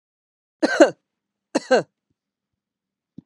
{"three_cough_length": "3.3 s", "three_cough_amplitude": 32065, "three_cough_signal_mean_std_ratio": 0.25, "survey_phase": "beta (2021-08-13 to 2022-03-07)", "age": "45-64", "gender": "Female", "wearing_mask": "No", "symptom_none": true, "smoker_status": "Ex-smoker", "respiratory_condition_asthma": false, "respiratory_condition_other": false, "recruitment_source": "REACT", "submission_delay": "2 days", "covid_test_result": "Negative", "covid_test_method": "RT-qPCR", "influenza_a_test_result": "Unknown/Void", "influenza_b_test_result": "Unknown/Void"}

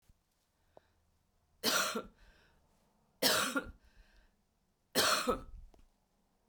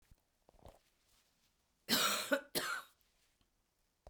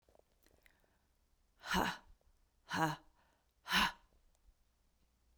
{"three_cough_length": "6.5 s", "three_cough_amplitude": 7583, "three_cough_signal_mean_std_ratio": 0.36, "cough_length": "4.1 s", "cough_amplitude": 4541, "cough_signal_mean_std_ratio": 0.34, "exhalation_length": "5.4 s", "exhalation_amplitude": 3263, "exhalation_signal_mean_std_ratio": 0.31, "survey_phase": "beta (2021-08-13 to 2022-03-07)", "age": "45-64", "gender": "Female", "wearing_mask": "No", "symptom_cough_any": true, "symptom_runny_or_blocked_nose": true, "symptom_shortness_of_breath": true, "symptom_fever_high_temperature": true, "symptom_headache": true, "symptom_onset": "3 days", "smoker_status": "Never smoked", "respiratory_condition_asthma": false, "respiratory_condition_other": false, "recruitment_source": "Test and Trace", "submission_delay": "2 days", "covid_test_result": "Positive", "covid_test_method": "RT-qPCR", "covid_ct_value": 20.3, "covid_ct_gene": "ORF1ab gene", "covid_ct_mean": 21.2, "covid_viral_load": "110000 copies/ml", "covid_viral_load_category": "Low viral load (10K-1M copies/ml)"}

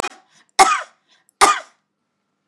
{"cough_length": "2.5 s", "cough_amplitude": 32768, "cough_signal_mean_std_ratio": 0.3, "survey_phase": "beta (2021-08-13 to 2022-03-07)", "age": "65+", "gender": "Female", "wearing_mask": "No", "symptom_none": true, "smoker_status": "Never smoked", "respiratory_condition_asthma": false, "respiratory_condition_other": false, "recruitment_source": "REACT", "submission_delay": "1 day", "covid_test_result": "Negative", "covid_test_method": "RT-qPCR", "influenza_a_test_result": "Negative", "influenza_b_test_result": "Negative"}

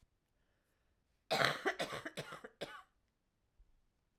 {"cough_length": "4.2 s", "cough_amplitude": 6464, "cough_signal_mean_std_ratio": 0.33, "survey_phase": "alpha (2021-03-01 to 2021-08-12)", "age": "45-64", "gender": "Female", "wearing_mask": "Yes", "symptom_cough_any": true, "symptom_shortness_of_breath": true, "symptom_headache": true, "symptom_change_to_sense_of_smell_or_taste": true, "symptom_loss_of_taste": true, "symptom_onset": "4 days", "smoker_status": "Never smoked", "respiratory_condition_asthma": false, "respiratory_condition_other": false, "recruitment_source": "Test and Trace", "submission_delay": "2 days", "covid_test_result": "Positive", "covid_test_method": "RT-qPCR", "covid_ct_value": 16.3, "covid_ct_gene": "ORF1ab gene", "covid_ct_mean": 16.7, "covid_viral_load": "3200000 copies/ml", "covid_viral_load_category": "High viral load (>1M copies/ml)"}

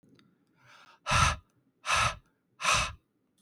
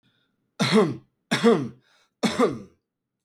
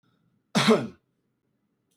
{"exhalation_length": "3.4 s", "exhalation_amplitude": 8956, "exhalation_signal_mean_std_ratio": 0.41, "three_cough_length": "3.2 s", "three_cough_amplitude": 18191, "three_cough_signal_mean_std_ratio": 0.43, "cough_length": "2.0 s", "cough_amplitude": 13996, "cough_signal_mean_std_ratio": 0.3, "survey_phase": "beta (2021-08-13 to 2022-03-07)", "age": "18-44", "gender": "Male", "wearing_mask": "No", "symptom_runny_or_blocked_nose": true, "symptom_sore_throat": true, "symptom_fatigue": true, "smoker_status": "Current smoker (e-cigarettes or vapes only)", "respiratory_condition_asthma": false, "respiratory_condition_other": false, "recruitment_source": "Test and Trace", "submission_delay": "2 days", "covid_test_result": "Positive", "covid_test_method": "RT-qPCR"}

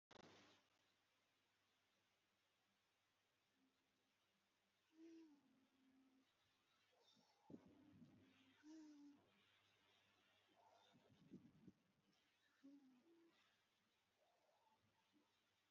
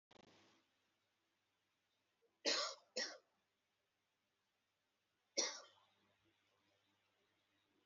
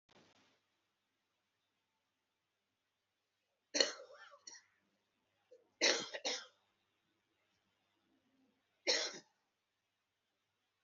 {"exhalation_length": "15.7 s", "exhalation_amplitude": 125, "exhalation_signal_mean_std_ratio": 0.61, "three_cough_length": "7.9 s", "three_cough_amplitude": 2081, "three_cough_signal_mean_std_ratio": 0.24, "cough_length": "10.8 s", "cough_amplitude": 8190, "cough_signal_mean_std_ratio": 0.22, "survey_phase": "alpha (2021-03-01 to 2021-08-12)", "age": "45-64", "gender": "Male", "wearing_mask": "Yes", "symptom_new_continuous_cough": true, "smoker_status": "Never smoked", "respiratory_condition_asthma": false, "respiratory_condition_other": false, "recruitment_source": "Test and Trace", "submission_delay": "2 days", "covid_test_result": "Positive", "covid_test_method": "RT-qPCR", "covid_ct_value": 12.5, "covid_ct_gene": "ORF1ab gene", "covid_ct_mean": 12.8, "covid_viral_load": "62000000 copies/ml", "covid_viral_load_category": "High viral load (>1M copies/ml)"}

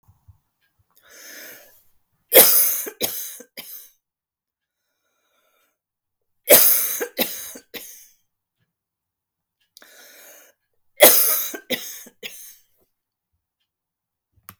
{"three_cough_length": "14.6 s", "three_cough_amplitude": 32768, "three_cough_signal_mean_std_ratio": 0.27, "survey_phase": "beta (2021-08-13 to 2022-03-07)", "age": "65+", "gender": "Female", "wearing_mask": "No", "symptom_none": true, "smoker_status": "Never smoked", "respiratory_condition_asthma": false, "respiratory_condition_other": false, "recruitment_source": "REACT", "submission_delay": "1 day", "covid_test_result": "Negative", "covid_test_method": "RT-qPCR"}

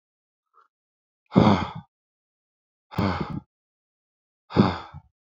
{"exhalation_length": "5.3 s", "exhalation_amplitude": 25614, "exhalation_signal_mean_std_ratio": 0.29, "survey_phase": "beta (2021-08-13 to 2022-03-07)", "age": "18-44", "gender": "Male", "wearing_mask": "No", "symptom_none": true, "smoker_status": "Ex-smoker", "respiratory_condition_asthma": false, "respiratory_condition_other": false, "recruitment_source": "REACT", "submission_delay": "0 days", "covid_test_result": "Negative", "covid_test_method": "RT-qPCR", "influenza_a_test_result": "Negative", "influenza_b_test_result": "Negative"}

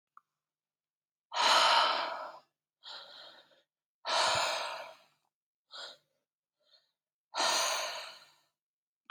{"exhalation_length": "9.1 s", "exhalation_amplitude": 7529, "exhalation_signal_mean_std_ratio": 0.41, "survey_phase": "beta (2021-08-13 to 2022-03-07)", "age": "18-44", "gender": "Female", "wearing_mask": "No", "symptom_cough_any": true, "symptom_runny_or_blocked_nose": true, "symptom_fatigue": true, "symptom_fever_high_temperature": true, "symptom_headache": true, "smoker_status": "Never smoked", "respiratory_condition_asthma": false, "respiratory_condition_other": false, "recruitment_source": "Test and Trace", "submission_delay": "4 days", "covid_test_result": "Negative", "covid_test_method": "RT-qPCR"}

